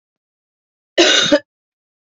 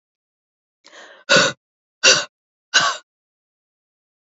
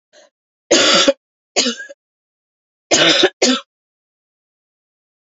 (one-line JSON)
{"cough_length": "2.0 s", "cough_amplitude": 29454, "cough_signal_mean_std_ratio": 0.36, "exhalation_length": "4.4 s", "exhalation_amplitude": 31017, "exhalation_signal_mean_std_ratio": 0.29, "three_cough_length": "5.2 s", "three_cough_amplitude": 31891, "three_cough_signal_mean_std_ratio": 0.39, "survey_phase": "beta (2021-08-13 to 2022-03-07)", "age": "18-44", "gender": "Female", "wearing_mask": "No", "symptom_cough_any": true, "symptom_new_continuous_cough": true, "symptom_runny_or_blocked_nose": true, "symptom_shortness_of_breath": true, "symptom_sore_throat": true, "symptom_abdominal_pain": true, "symptom_diarrhoea": true, "symptom_fatigue": true, "symptom_fever_high_temperature": true, "symptom_headache": true, "symptom_change_to_sense_of_smell_or_taste": true, "symptom_other": true, "smoker_status": "Never smoked", "respiratory_condition_asthma": false, "respiratory_condition_other": false, "recruitment_source": "Test and Trace", "submission_delay": "2 days", "covid_test_result": "Positive", "covid_test_method": "RT-qPCR", "covid_ct_value": 27.8, "covid_ct_gene": "ORF1ab gene"}